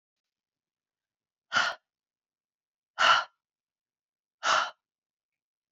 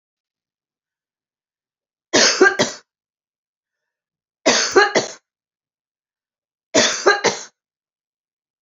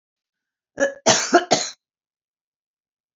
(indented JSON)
{
  "exhalation_length": "5.7 s",
  "exhalation_amplitude": 11166,
  "exhalation_signal_mean_std_ratio": 0.26,
  "three_cough_length": "8.6 s",
  "three_cough_amplitude": 30601,
  "three_cough_signal_mean_std_ratio": 0.32,
  "cough_length": "3.2 s",
  "cough_amplitude": 29338,
  "cough_signal_mean_std_ratio": 0.32,
  "survey_phase": "beta (2021-08-13 to 2022-03-07)",
  "age": "45-64",
  "gender": "Female",
  "wearing_mask": "No",
  "symptom_fatigue": true,
  "smoker_status": "Never smoked",
  "respiratory_condition_asthma": false,
  "respiratory_condition_other": false,
  "recruitment_source": "REACT",
  "submission_delay": "7 days",
  "covid_test_result": "Negative",
  "covid_test_method": "RT-qPCR",
  "influenza_a_test_result": "Negative",
  "influenza_b_test_result": "Negative"
}